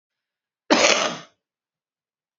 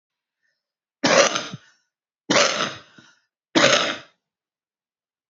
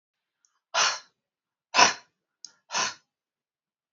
cough_length: 2.4 s
cough_amplitude: 31252
cough_signal_mean_std_ratio: 0.32
three_cough_length: 5.3 s
three_cough_amplitude: 30890
three_cough_signal_mean_std_ratio: 0.36
exhalation_length: 3.9 s
exhalation_amplitude: 27976
exhalation_signal_mean_std_ratio: 0.27
survey_phase: beta (2021-08-13 to 2022-03-07)
age: 45-64
gender: Female
wearing_mask: 'No'
symptom_cough_any: true
symptom_sore_throat: true
symptom_fatigue: true
symptom_onset: 6 days
smoker_status: Never smoked
respiratory_condition_asthma: false
respiratory_condition_other: false
recruitment_source: REACT
submission_delay: 2 days
covid_test_result: Negative
covid_test_method: RT-qPCR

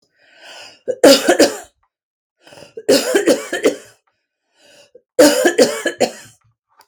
three_cough_length: 6.9 s
three_cough_amplitude: 32768
three_cough_signal_mean_std_ratio: 0.41
survey_phase: beta (2021-08-13 to 2022-03-07)
age: 45-64
gender: Female
wearing_mask: 'No'
symptom_none: true
smoker_status: Ex-smoker
respiratory_condition_asthma: true
respiratory_condition_other: false
recruitment_source: REACT
submission_delay: 1 day
covid_test_result: Negative
covid_test_method: RT-qPCR
influenza_a_test_result: Negative
influenza_b_test_result: Negative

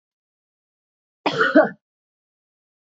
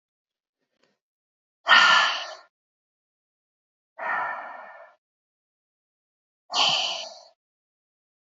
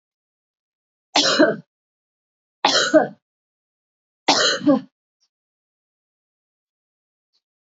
cough_length: 2.8 s
cough_amplitude: 26351
cough_signal_mean_std_ratio: 0.26
exhalation_length: 8.3 s
exhalation_amplitude: 22262
exhalation_signal_mean_std_ratio: 0.3
three_cough_length: 7.7 s
three_cough_amplitude: 27384
three_cough_signal_mean_std_ratio: 0.31
survey_phase: beta (2021-08-13 to 2022-03-07)
age: 45-64
gender: Female
wearing_mask: 'No'
symptom_cough_any: true
symptom_runny_or_blocked_nose: true
symptom_sore_throat: true
symptom_fatigue: true
symptom_headache: true
symptom_change_to_sense_of_smell_or_taste: true
symptom_other: true
symptom_onset: 2 days
smoker_status: Ex-smoker
respiratory_condition_asthma: false
respiratory_condition_other: false
recruitment_source: Test and Trace
submission_delay: 2 days
covid_test_result: Positive
covid_test_method: RT-qPCR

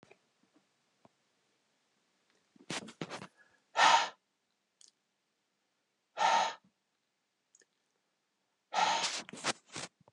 exhalation_length: 10.1 s
exhalation_amplitude: 7444
exhalation_signal_mean_std_ratio: 0.29
survey_phase: beta (2021-08-13 to 2022-03-07)
age: 45-64
gender: Male
wearing_mask: 'No'
symptom_none: true
smoker_status: Ex-smoker
respiratory_condition_asthma: false
respiratory_condition_other: false
recruitment_source: REACT
submission_delay: 4 days
covid_test_result: Negative
covid_test_method: RT-qPCR
influenza_a_test_result: Negative
influenza_b_test_result: Negative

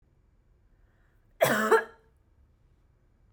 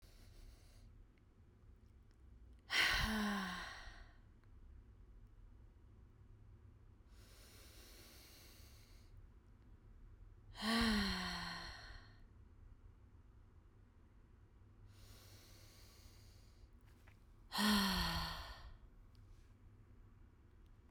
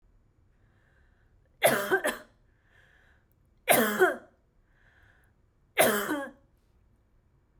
cough_length: 3.3 s
cough_amplitude: 11169
cough_signal_mean_std_ratio: 0.28
exhalation_length: 20.9 s
exhalation_amplitude: 2394
exhalation_signal_mean_std_ratio: 0.44
three_cough_length: 7.6 s
three_cough_amplitude: 13714
three_cough_signal_mean_std_ratio: 0.34
survey_phase: beta (2021-08-13 to 2022-03-07)
age: 18-44
gender: Female
wearing_mask: 'No'
symptom_none: true
smoker_status: Ex-smoker
respiratory_condition_asthma: false
respiratory_condition_other: false
recruitment_source: REACT
submission_delay: 4 days
covid_test_result: Negative
covid_test_method: RT-qPCR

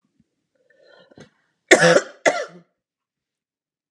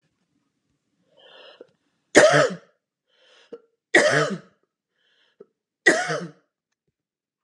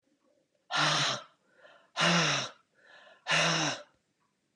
cough_length: 3.9 s
cough_amplitude: 32768
cough_signal_mean_std_ratio: 0.26
three_cough_length: 7.4 s
three_cough_amplitude: 32767
three_cough_signal_mean_std_ratio: 0.29
exhalation_length: 4.6 s
exhalation_amplitude: 7322
exhalation_signal_mean_std_ratio: 0.5
survey_phase: beta (2021-08-13 to 2022-03-07)
age: 45-64
gender: Female
wearing_mask: 'No'
symptom_none: true
smoker_status: Ex-smoker
respiratory_condition_asthma: false
respiratory_condition_other: false
recruitment_source: REACT
submission_delay: 6 days
covid_test_result: Negative
covid_test_method: RT-qPCR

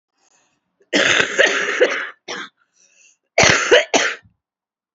cough_length: 4.9 s
cough_amplitude: 31189
cough_signal_mean_std_ratio: 0.47
survey_phase: alpha (2021-03-01 to 2021-08-12)
age: 18-44
gender: Female
wearing_mask: 'No'
symptom_cough_any: true
symptom_shortness_of_breath: true
symptom_diarrhoea: true
symptom_fatigue: true
symptom_headache: true
symptom_change_to_sense_of_smell_or_taste: true
symptom_loss_of_taste: true
symptom_onset: 4 days
smoker_status: Current smoker (11 or more cigarettes per day)
respiratory_condition_asthma: false
respiratory_condition_other: false
recruitment_source: Test and Trace
submission_delay: 2 days
covid_test_result: Positive
covid_test_method: RT-qPCR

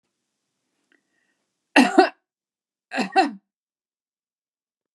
cough_length: 4.9 s
cough_amplitude: 32555
cough_signal_mean_std_ratio: 0.24
survey_phase: beta (2021-08-13 to 2022-03-07)
age: 45-64
gender: Female
wearing_mask: 'No'
symptom_none: true
smoker_status: Ex-smoker
respiratory_condition_asthma: false
respiratory_condition_other: false
recruitment_source: REACT
submission_delay: 1 day
covid_test_result: Negative
covid_test_method: RT-qPCR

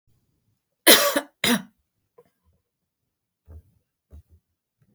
cough_length: 4.9 s
cough_amplitude: 32768
cough_signal_mean_std_ratio: 0.22
survey_phase: beta (2021-08-13 to 2022-03-07)
age: 45-64
gender: Female
wearing_mask: 'No'
symptom_cough_any: true
symptom_runny_or_blocked_nose: true
symptom_sore_throat: true
symptom_headache: true
symptom_other: true
symptom_onset: 3 days
smoker_status: Never smoked
respiratory_condition_asthma: false
respiratory_condition_other: false
recruitment_source: Test and Trace
submission_delay: 1 day
covid_test_result: Positive
covid_test_method: RT-qPCR
covid_ct_value: 17.3
covid_ct_gene: ORF1ab gene
covid_ct_mean: 17.7
covid_viral_load: 1500000 copies/ml
covid_viral_load_category: High viral load (>1M copies/ml)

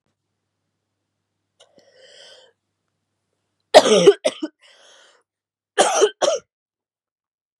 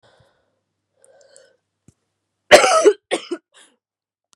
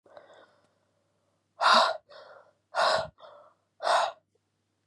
three_cough_length: 7.6 s
three_cough_amplitude: 32768
three_cough_signal_mean_std_ratio: 0.25
cough_length: 4.4 s
cough_amplitude: 32768
cough_signal_mean_std_ratio: 0.25
exhalation_length: 4.9 s
exhalation_amplitude: 15209
exhalation_signal_mean_std_ratio: 0.36
survey_phase: beta (2021-08-13 to 2022-03-07)
age: 18-44
gender: Female
wearing_mask: 'No'
symptom_cough_any: true
symptom_new_continuous_cough: true
symptom_runny_or_blocked_nose: true
symptom_shortness_of_breath: true
symptom_sore_throat: true
symptom_fatigue: true
symptom_fever_high_temperature: true
symptom_headache: true
symptom_change_to_sense_of_smell_or_taste: true
symptom_other: true
symptom_onset: 3 days
smoker_status: Never smoked
respiratory_condition_asthma: false
respiratory_condition_other: false
recruitment_source: Test and Trace
submission_delay: 2 days
covid_test_result: Positive
covid_test_method: RT-qPCR
covid_ct_value: 19.3
covid_ct_gene: ORF1ab gene
covid_ct_mean: 19.8
covid_viral_load: 330000 copies/ml
covid_viral_load_category: Low viral load (10K-1M copies/ml)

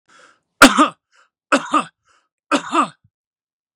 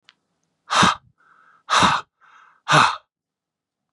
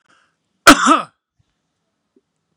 three_cough_length: 3.8 s
three_cough_amplitude: 32768
three_cough_signal_mean_std_ratio: 0.31
exhalation_length: 3.9 s
exhalation_amplitude: 28592
exhalation_signal_mean_std_ratio: 0.36
cough_length: 2.6 s
cough_amplitude: 32768
cough_signal_mean_std_ratio: 0.26
survey_phase: beta (2021-08-13 to 2022-03-07)
age: 45-64
gender: Male
wearing_mask: 'No'
symptom_none: true
smoker_status: Ex-smoker
respiratory_condition_asthma: false
respiratory_condition_other: false
recruitment_source: REACT
submission_delay: 2 days
covid_test_result: Negative
covid_test_method: RT-qPCR
influenza_a_test_result: Negative
influenza_b_test_result: Negative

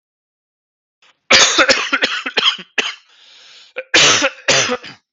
cough_length: 5.1 s
cough_amplitude: 32767
cough_signal_mean_std_ratio: 0.49
survey_phase: beta (2021-08-13 to 2022-03-07)
age: 45-64
gender: Male
wearing_mask: 'No'
symptom_new_continuous_cough: true
symptom_runny_or_blocked_nose: true
symptom_fatigue: true
symptom_change_to_sense_of_smell_or_taste: true
symptom_onset: 3 days
smoker_status: Ex-smoker
respiratory_condition_asthma: false
respiratory_condition_other: false
recruitment_source: Test and Trace
submission_delay: 1 day
covid_test_result: Positive
covid_test_method: RT-qPCR
covid_ct_value: 16.4
covid_ct_gene: ORF1ab gene
covid_ct_mean: 17.6
covid_viral_load: 1700000 copies/ml
covid_viral_load_category: High viral load (>1M copies/ml)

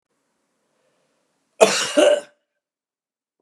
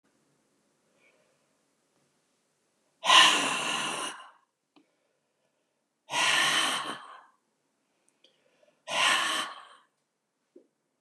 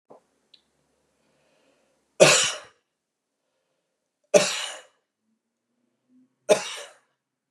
cough_length: 3.4 s
cough_amplitude: 32768
cough_signal_mean_std_ratio: 0.29
exhalation_length: 11.0 s
exhalation_amplitude: 19734
exhalation_signal_mean_std_ratio: 0.35
three_cough_length: 7.5 s
three_cough_amplitude: 32064
three_cough_signal_mean_std_ratio: 0.23
survey_phase: beta (2021-08-13 to 2022-03-07)
age: 65+
gender: Male
wearing_mask: 'No'
symptom_none: true
smoker_status: Ex-smoker
respiratory_condition_asthma: false
respiratory_condition_other: false
recruitment_source: REACT
submission_delay: 1 day
covid_test_result: Negative
covid_test_method: RT-qPCR
influenza_a_test_result: Negative
influenza_b_test_result: Negative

